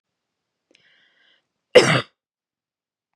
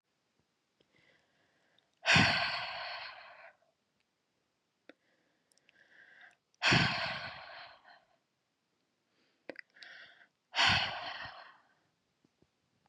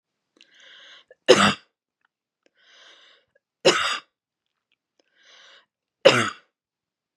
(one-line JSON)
{"cough_length": "3.2 s", "cough_amplitude": 32768, "cough_signal_mean_std_ratio": 0.2, "exhalation_length": "12.9 s", "exhalation_amplitude": 7083, "exhalation_signal_mean_std_ratio": 0.31, "three_cough_length": "7.2 s", "three_cough_amplitude": 32767, "three_cough_signal_mean_std_ratio": 0.24, "survey_phase": "beta (2021-08-13 to 2022-03-07)", "age": "18-44", "gender": "Female", "wearing_mask": "No", "symptom_none": true, "symptom_onset": "6 days", "smoker_status": "Never smoked", "respiratory_condition_asthma": false, "respiratory_condition_other": false, "recruitment_source": "REACT", "submission_delay": "1 day", "covid_test_result": "Negative", "covid_test_method": "RT-qPCR", "influenza_a_test_result": "Negative", "influenza_b_test_result": "Negative"}